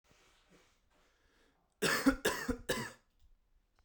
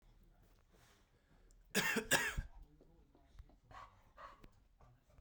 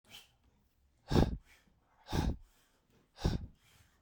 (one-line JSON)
{"three_cough_length": "3.8 s", "three_cough_amplitude": 5858, "three_cough_signal_mean_std_ratio": 0.35, "cough_length": "5.2 s", "cough_amplitude": 3857, "cough_signal_mean_std_ratio": 0.33, "exhalation_length": "4.0 s", "exhalation_amplitude": 7372, "exhalation_signal_mean_std_ratio": 0.32, "survey_phase": "beta (2021-08-13 to 2022-03-07)", "age": "18-44", "gender": "Male", "wearing_mask": "No", "symptom_none": true, "smoker_status": "Never smoked", "respiratory_condition_asthma": false, "respiratory_condition_other": false, "recruitment_source": "REACT", "submission_delay": "2 days", "covid_test_result": "Negative", "covid_test_method": "RT-qPCR", "influenza_a_test_result": "Negative", "influenza_b_test_result": "Negative"}